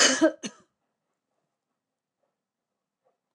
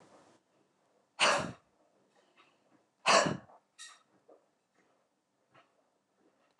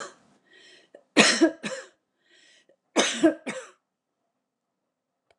{"cough_length": "3.3 s", "cough_amplitude": 16915, "cough_signal_mean_std_ratio": 0.24, "exhalation_length": "6.6 s", "exhalation_amplitude": 8528, "exhalation_signal_mean_std_ratio": 0.24, "three_cough_length": "5.4 s", "three_cough_amplitude": 24347, "three_cough_signal_mean_std_ratio": 0.3, "survey_phase": "beta (2021-08-13 to 2022-03-07)", "age": "65+", "gender": "Female", "wearing_mask": "No", "symptom_none": true, "smoker_status": "Never smoked", "respiratory_condition_asthma": false, "respiratory_condition_other": false, "recruitment_source": "REACT", "submission_delay": "1 day", "covid_test_result": "Negative", "covid_test_method": "RT-qPCR"}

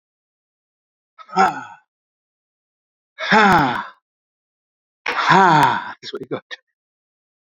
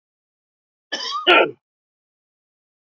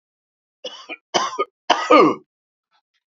{"exhalation_length": "7.4 s", "exhalation_amplitude": 30338, "exhalation_signal_mean_std_ratio": 0.37, "cough_length": "2.8 s", "cough_amplitude": 28935, "cough_signal_mean_std_ratio": 0.28, "three_cough_length": "3.1 s", "three_cough_amplitude": 30629, "three_cough_signal_mean_std_ratio": 0.34, "survey_phase": "beta (2021-08-13 to 2022-03-07)", "age": "65+", "gender": "Male", "wearing_mask": "No", "symptom_none": true, "smoker_status": "Never smoked", "respiratory_condition_asthma": true, "respiratory_condition_other": false, "recruitment_source": "REACT", "submission_delay": "1 day", "covid_test_result": "Negative", "covid_test_method": "RT-qPCR", "influenza_a_test_result": "Negative", "influenza_b_test_result": "Negative"}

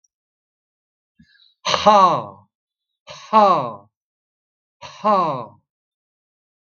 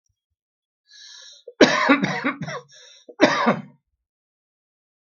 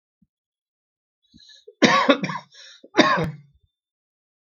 {"exhalation_length": "6.7 s", "exhalation_amplitude": 32768, "exhalation_signal_mean_std_ratio": 0.34, "cough_length": "5.1 s", "cough_amplitude": 32767, "cough_signal_mean_std_ratio": 0.35, "three_cough_length": "4.4 s", "three_cough_amplitude": 32768, "three_cough_signal_mean_std_ratio": 0.32, "survey_phase": "beta (2021-08-13 to 2022-03-07)", "age": "65+", "gender": "Male", "wearing_mask": "No", "symptom_cough_any": true, "smoker_status": "Ex-smoker", "respiratory_condition_asthma": false, "respiratory_condition_other": false, "recruitment_source": "REACT", "submission_delay": "2 days", "covid_test_result": "Negative", "covid_test_method": "RT-qPCR", "influenza_a_test_result": "Negative", "influenza_b_test_result": "Negative"}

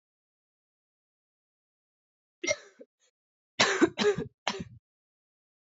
{"three_cough_length": "5.7 s", "three_cough_amplitude": 17334, "three_cough_signal_mean_std_ratio": 0.27, "survey_phase": "beta (2021-08-13 to 2022-03-07)", "age": "18-44", "gender": "Female", "wearing_mask": "No", "symptom_cough_any": true, "symptom_new_continuous_cough": true, "symptom_runny_or_blocked_nose": true, "symptom_shortness_of_breath": true, "symptom_fatigue": true, "symptom_headache": true, "symptom_change_to_sense_of_smell_or_taste": true, "symptom_loss_of_taste": true, "symptom_onset": "3 days", "smoker_status": "Never smoked", "respiratory_condition_asthma": true, "respiratory_condition_other": false, "recruitment_source": "Test and Trace", "submission_delay": "2 days", "covid_test_result": "Positive", "covid_test_method": "ePCR"}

